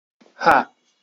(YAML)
exhalation_length: 1.0 s
exhalation_amplitude: 27478
exhalation_signal_mean_std_ratio: 0.34
survey_phase: beta (2021-08-13 to 2022-03-07)
age: 18-44
gender: Male
wearing_mask: 'No'
symptom_none: true
smoker_status: Ex-smoker
respiratory_condition_asthma: true
respiratory_condition_other: false
recruitment_source: Test and Trace
submission_delay: 0 days
covid_test_result: Positive
covid_test_method: LFT